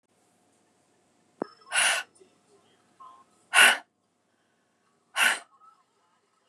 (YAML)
exhalation_length: 6.5 s
exhalation_amplitude: 23692
exhalation_signal_mean_std_ratio: 0.26
survey_phase: beta (2021-08-13 to 2022-03-07)
age: 45-64
gender: Female
wearing_mask: 'No'
symptom_none: true
smoker_status: Current smoker (11 or more cigarettes per day)
respiratory_condition_asthma: false
respiratory_condition_other: false
recruitment_source: REACT
submission_delay: 1 day
covid_test_result: Negative
covid_test_method: RT-qPCR